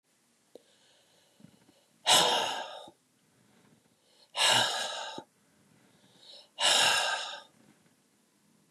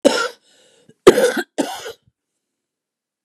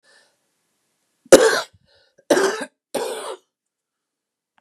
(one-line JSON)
{"exhalation_length": "8.7 s", "exhalation_amplitude": 11075, "exhalation_signal_mean_std_ratio": 0.39, "cough_length": "3.2 s", "cough_amplitude": 32768, "cough_signal_mean_std_ratio": 0.31, "three_cough_length": "4.6 s", "three_cough_amplitude": 32768, "three_cough_signal_mean_std_ratio": 0.27, "survey_phase": "beta (2021-08-13 to 2022-03-07)", "age": "65+", "gender": "Female", "wearing_mask": "No", "symptom_cough_any": true, "smoker_status": "Never smoked", "respiratory_condition_asthma": false, "respiratory_condition_other": false, "recruitment_source": "Test and Trace", "submission_delay": "0 days", "covid_test_result": "Negative", "covid_test_method": "LFT"}